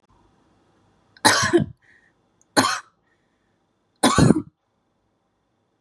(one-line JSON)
{"three_cough_length": "5.8 s", "three_cough_amplitude": 32768, "three_cough_signal_mean_std_ratio": 0.31, "survey_phase": "beta (2021-08-13 to 2022-03-07)", "age": "18-44", "gender": "Female", "wearing_mask": "No", "symptom_none": true, "smoker_status": "Never smoked", "respiratory_condition_asthma": false, "respiratory_condition_other": false, "recruitment_source": "REACT", "submission_delay": "1 day", "covid_test_result": "Negative", "covid_test_method": "RT-qPCR", "influenza_a_test_result": "Negative", "influenza_b_test_result": "Negative"}